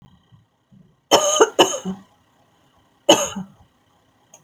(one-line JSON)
{"cough_length": "4.4 s", "cough_amplitude": 32768, "cough_signal_mean_std_ratio": 0.32, "survey_phase": "beta (2021-08-13 to 2022-03-07)", "age": "45-64", "gender": "Female", "wearing_mask": "No", "symptom_none": true, "smoker_status": "Ex-smoker", "respiratory_condition_asthma": false, "respiratory_condition_other": false, "recruitment_source": "Test and Trace", "submission_delay": "2 days", "covid_test_result": "Negative", "covid_test_method": "RT-qPCR"}